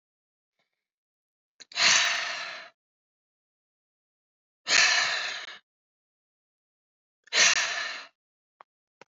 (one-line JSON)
{"exhalation_length": "9.1 s", "exhalation_amplitude": 14379, "exhalation_signal_mean_std_ratio": 0.35, "survey_phase": "alpha (2021-03-01 to 2021-08-12)", "age": "18-44", "gender": "Female", "wearing_mask": "No", "symptom_cough_any": true, "symptom_fatigue": true, "symptom_headache": true, "smoker_status": "Never smoked", "respiratory_condition_asthma": false, "respiratory_condition_other": false, "recruitment_source": "Test and Trace", "submission_delay": "2 days", "covid_test_result": "Positive", "covid_test_method": "RT-qPCR", "covid_ct_value": 22.9, "covid_ct_gene": "ORF1ab gene"}